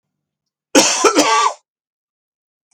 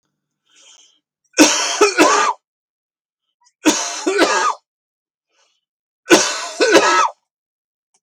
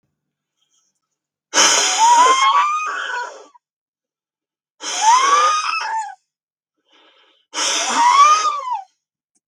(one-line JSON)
{"cough_length": "2.7 s", "cough_amplitude": 32768, "cough_signal_mean_std_ratio": 0.42, "three_cough_length": "8.0 s", "three_cough_amplitude": 32768, "three_cough_signal_mean_std_ratio": 0.44, "exhalation_length": "9.5 s", "exhalation_amplitude": 32767, "exhalation_signal_mean_std_ratio": 0.56, "survey_phase": "beta (2021-08-13 to 2022-03-07)", "age": "65+", "gender": "Male", "wearing_mask": "No", "symptom_cough_any": true, "symptom_runny_or_blocked_nose": true, "symptom_shortness_of_breath": true, "symptom_sore_throat": true, "symptom_fatigue": true, "symptom_onset": "8 days", "smoker_status": "Never smoked", "respiratory_condition_asthma": false, "respiratory_condition_other": false, "recruitment_source": "REACT", "submission_delay": "-1 day", "covid_test_result": "Negative", "covid_test_method": "RT-qPCR", "influenza_a_test_result": "Negative", "influenza_b_test_result": "Negative"}